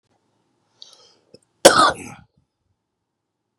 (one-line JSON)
{"cough_length": "3.6 s", "cough_amplitude": 32768, "cough_signal_mean_std_ratio": 0.21, "survey_phase": "beta (2021-08-13 to 2022-03-07)", "age": "45-64", "gender": "Male", "wearing_mask": "No", "symptom_none": true, "smoker_status": "Current smoker (11 or more cigarettes per day)", "respiratory_condition_asthma": false, "respiratory_condition_other": false, "recruitment_source": "REACT", "submission_delay": "2 days", "covid_test_result": "Negative", "covid_test_method": "RT-qPCR", "influenza_a_test_result": "Negative", "influenza_b_test_result": "Negative"}